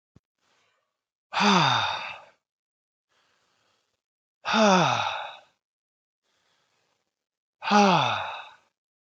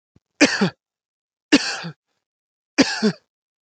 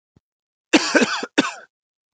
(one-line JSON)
{"exhalation_length": "9.0 s", "exhalation_amplitude": 16554, "exhalation_signal_mean_std_ratio": 0.38, "three_cough_length": "3.6 s", "three_cough_amplitude": 29115, "three_cough_signal_mean_std_ratio": 0.33, "cough_length": "2.1 s", "cough_amplitude": 32016, "cough_signal_mean_std_ratio": 0.37, "survey_phase": "alpha (2021-03-01 to 2021-08-12)", "age": "18-44", "gender": "Male", "wearing_mask": "No", "symptom_fatigue": true, "symptom_onset": "5 days", "smoker_status": "Ex-smoker", "respiratory_condition_asthma": false, "respiratory_condition_other": false, "recruitment_source": "REACT", "submission_delay": "1 day", "covid_test_result": "Negative", "covid_test_method": "RT-qPCR"}